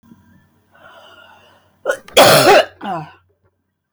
{
  "cough_length": "3.9 s",
  "cough_amplitude": 32768,
  "cough_signal_mean_std_ratio": 0.36,
  "survey_phase": "beta (2021-08-13 to 2022-03-07)",
  "age": "65+",
  "gender": "Female",
  "wearing_mask": "No",
  "symptom_none": true,
  "smoker_status": "Never smoked",
  "respiratory_condition_asthma": false,
  "respiratory_condition_other": false,
  "recruitment_source": "REACT",
  "submission_delay": "1 day",
  "covid_test_result": "Negative",
  "covid_test_method": "RT-qPCR"
}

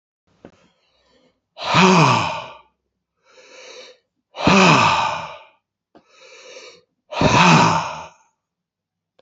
{
  "exhalation_length": "9.2 s",
  "exhalation_amplitude": 32005,
  "exhalation_signal_mean_std_ratio": 0.42,
  "survey_phase": "beta (2021-08-13 to 2022-03-07)",
  "age": "65+",
  "gender": "Male",
  "wearing_mask": "No",
  "symptom_none": true,
  "symptom_onset": "12 days",
  "smoker_status": "Ex-smoker",
  "respiratory_condition_asthma": false,
  "respiratory_condition_other": false,
  "recruitment_source": "REACT",
  "submission_delay": "5 days",
  "covid_test_result": "Negative",
  "covid_test_method": "RT-qPCR"
}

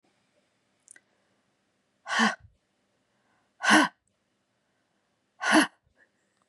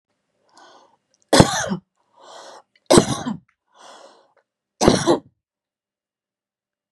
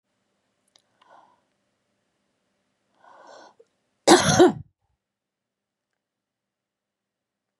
{
  "exhalation_length": "6.5 s",
  "exhalation_amplitude": 16569,
  "exhalation_signal_mean_std_ratio": 0.26,
  "three_cough_length": "6.9 s",
  "three_cough_amplitude": 32768,
  "three_cough_signal_mean_std_ratio": 0.27,
  "cough_length": "7.6 s",
  "cough_amplitude": 30003,
  "cough_signal_mean_std_ratio": 0.19,
  "survey_phase": "beta (2021-08-13 to 2022-03-07)",
  "age": "45-64",
  "gender": "Female",
  "wearing_mask": "No",
  "symptom_none": true,
  "smoker_status": "Never smoked",
  "respiratory_condition_asthma": false,
  "respiratory_condition_other": false,
  "recruitment_source": "REACT",
  "submission_delay": "1 day",
  "covid_test_result": "Negative",
  "covid_test_method": "RT-qPCR",
  "influenza_a_test_result": "Negative",
  "influenza_b_test_result": "Negative"
}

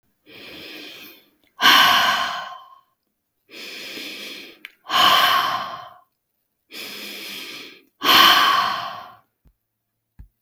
{
  "exhalation_length": "10.4 s",
  "exhalation_amplitude": 32766,
  "exhalation_signal_mean_std_ratio": 0.44,
  "survey_phase": "beta (2021-08-13 to 2022-03-07)",
  "age": "45-64",
  "gender": "Female",
  "wearing_mask": "No",
  "symptom_none": true,
  "smoker_status": "Ex-smoker",
  "respiratory_condition_asthma": false,
  "respiratory_condition_other": false,
  "recruitment_source": "REACT",
  "submission_delay": "5 days",
  "covid_test_result": "Negative",
  "covid_test_method": "RT-qPCR",
  "influenza_a_test_result": "Negative",
  "influenza_b_test_result": "Negative"
}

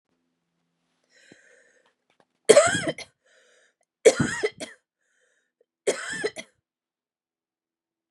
{
  "three_cough_length": "8.1 s",
  "three_cough_amplitude": 30638,
  "three_cough_signal_mean_std_ratio": 0.23,
  "survey_phase": "beta (2021-08-13 to 2022-03-07)",
  "age": "45-64",
  "gender": "Female",
  "wearing_mask": "No",
  "symptom_none": true,
  "smoker_status": "Ex-smoker",
  "respiratory_condition_asthma": false,
  "respiratory_condition_other": false,
  "recruitment_source": "REACT",
  "submission_delay": "1 day",
  "covid_test_result": "Negative",
  "covid_test_method": "RT-qPCR"
}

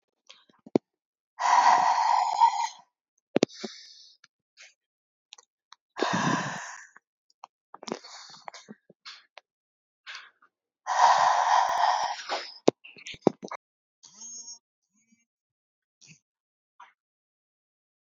{
  "exhalation_length": "18.0 s",
  "exhalation_amplitude": 26749,
  "exhalation_signal_mean_std_ratio": 0.35,
  "survey_phase": "beta (2021-08-13 to 2022-03-07)",
  "age": "18-44",
  "gender": "Female",
  "wearing_mask": "No",
  "symptom_runny_or_blocked_nose": true,
  "symptom_headache": true,
  "smoker_status": "Never smoked",
  "respiratory_condition_asthma": false,
  "respiratory_condition_other": false,
  "recruitment_source": "Test and Trace",
  "submission_delay": "2 days",
  "covid_test_result": "Positive",
  "covid_test_method": "ePCR"
}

